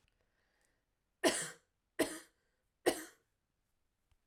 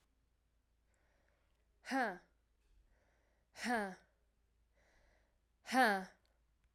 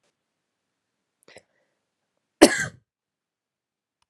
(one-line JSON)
{"three_cough_length": "4.3 s", "three_cough_amplitude": 4907, "three_cough_signal_mean_std_ratio": 0.25, "exhalation_length": "6.7 s", "exhalation_amplitude": 3274, "exhalation_signal_mean_std_ratio": 0.3, "cough_length": "4.1 s", "cough_amplitude": 32767, "cough_signal_mean_std_ratio": 0.14, "survey_phase": "alpha (2021-03-01 to 2021-08-12)", "age": "18-44", "gender": "Female", "wearing_mask": "No", "symptom_shortness_of_breath": true, "symptom_fatigue": true, "smoker_status": "Never smoked", "respiratory_condition_asthma": false, "respiratory_condition_other": false, "recruitment_source": "Test and Trace", "submission_delay": "2 days", "covid_test_result": "Positive", "covid_test_method": "RT-qPCR", "covid_ct_value": 16.7, "covid_ct_gene": "ORF1ab gene", "covid_ct_mean": 17.5, "covid_viral_load": "1800000 copies/ml", "covid_viral_load_category": "High viral load (>1M copies/ml)"}